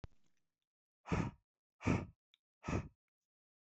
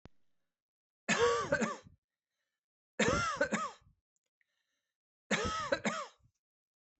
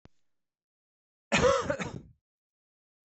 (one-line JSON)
{"exhalation_length": "3.8 s", "exhalation_amplitude": 3093, "exhalation_signal_mean_std_ratio": 0.31, "three_cough_length": "7.0 s", "three_cough_amplitude": 4724, "three_cough_signal_mean_std_ratio": 0.42, "cough_length": "3.1 s", "cough_amplitude": 8086, "cough_signal_mean_std_ratio": 0.32, "survey_phase": "beta (2021-08-13 to 2022-03-07)", "age": "45-64", "gender": "Male", "wearing_mask": "No", "symptom_none": true, "smoker_status": "Ex-smoker", "respiratory_condition_asthma": false, "respiratory_condition_other": false, "recruitment_source": "REACT", "submission_delay": "4 days", "covid_test_result": "Negative", "covid_test_method": "RT-qPCR", "influenza_a_test_result": "Negative", "influenza_b_test_result": "Negative"}